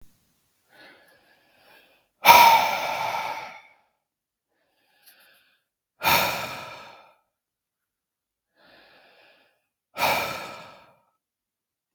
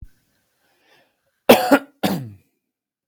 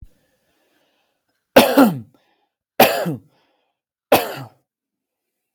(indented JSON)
{
  "exhalation_length": "11.9 s",
  "exhalation_amplitude": 32768,
  "exhalation_signal_mean_std_ratio": 0.28,
  "cough_length": "3.1 s",
  "cough_amplitude": 32768,
  "cough_signal_mean_std_ratio": 0.27,
  "three_cough_length": "5.5 s",
  "three_cough_amplitude": 32768,
  "three_cough_signal_mean_std_ratio": 0.29,
  "survey_phase": "beta (2021-08-13 to 2022-03-07)",
  "age": "18-44",
  "gender": "Male",
  "wearing_mask": "No",
  "symptom_none": true,
  "symptom_onset": "8 days",
  "smoker_status": "Ex-smoker",
  "respiratory_condition_asthma": false,
  "respiratory_condition_other": false,
  "recruitment_source": "REACT",
  "submission_delay": "1 day",
  "covid_test_result": "Negative",
  "covid_test_method": "RT-qPCR",
  "influenza_a_test_result": "Negative",
  "influenza_b_test_result": "Negative"
}